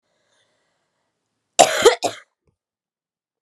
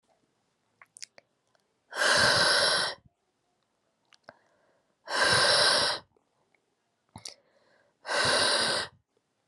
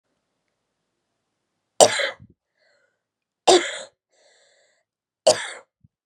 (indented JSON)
{
  "cough_length": "3.4 s",
  "cough_amplitude": 32768,
  "cough_signal_mean_std_ratio": 0.23,
  "exhalation_length": "9.5 s",
  "exhalation_amplitude": 9903,
  "exhalation_signal_mean_std_ratio": 0.45,
  "three_cough_length": "6.1 s",
  "three_cough_amplitude": 32768,
  "three_cough_signal_mean_std_ratio": 0.23,
  "survey_phase": "beta (2021-08-13 to 2022-03-07)",
  "age": "18-44",
  "gender": "Female",
  "wearing_mask": "No",
  "symptom_cough_any": true,
  "symptom_new_continuous_cough": true,
  "symptom_runny_or_blocked_nose": true,
  "symptom_sore_throat": true,
  "symptom_fatigue": true,
  "symptom_headache": true,
  "symptom_change_to_sense_of_smell_or_taste": true,
  "symptom_onset": "4 days",
  "smoker_status": "Never smoked",
  "respiratory_condition_asthma": false,
  "respiratory_condition_other": false,
  "recruitment_source": "Test and Trace",
  "submission_delay": "2 days",
  "covid_test_result": "Positive",
  "covid_test_method": "RT-qPCR",
  "covid_ct_value": 15.1,
  "covid_ct_gene": "ORF1ab gene",
  "covid_ct_mean": 15.6,
  "covid_viral_load": "7500000 copies/ml",
  "covid_viral_load_category": "High viral load (>1M copies/ml)"
}